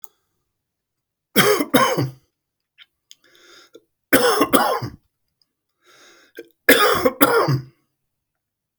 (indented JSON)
{
  "three_cough_length": "8.8 s",
  "three_cough_amplitude": 32768,
  "three_cough_signal_mean_std_ratio": 0.39,
  "survey_phase": "beta (2021-08-13 to 2022-03-07)",
  "age": "65+",
  "gender": "Male",
  "wearing_mask": "No",
  "symptom_fatigue": true,
  "smoker_status": "Ex-smoker",
  "respiratory_condition_asthma": false,
  "respiratory_condition_other": false,
  "recruitment_source": "REACT",
  "submission_delay": "1 day",
  "covid_test_result": "Negative",
  "covid_test_method": "RT-qPCR",
  "influenza_a_test_result": "Negative",
  "influenza_b_test_result": "Negative"
}